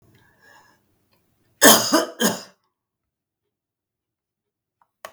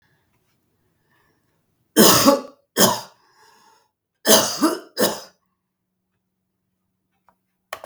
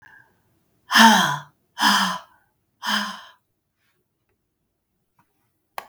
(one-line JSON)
{"cough_length": "5.1 s", "cough_amplitude": 32768, "cough_signal_mean_std_ratio": 0.24, "three_cough_length": "7.9 s", "three_cough_amplitude": 32768, "three_cough_signal_mean_std_ratio": 0.31, "exhalation_length": "5.9 s", "exhalation_amplitude": 32768, "exhalation_signal_mean_std_ratio": 0.31, "survey_phase": "beta (2021-08-13 to 2022-03-07)", "age": "45-64", "gender": "Female", "wearing_mask": "No", "symptom_runny_or_blocked_nose": true, "symptom_fatigue": true, "symptom_change_to_sense_of_smell_or_taste": true, "symptom_loss_of_taste": true, "symptom_other": true, "smoker_status": "Never smoked", "respiratory_condition_asthma": false, "respiratory_condition_other": false, "recruitment_source": "Test and Trace", "submission_delay": "2 days", "covid_test_result": "Positive", "covid_test_method": "RT-qPCR", "covid_ct_value": 19.6, "covid_ct_gene": "ORF1ab gene", "covid_ct_mean": 20.0, "covid_viral_load": "270000 copies/ml", "covid_viral_load_category": "Low viral load (10K-1M copies/ml)"}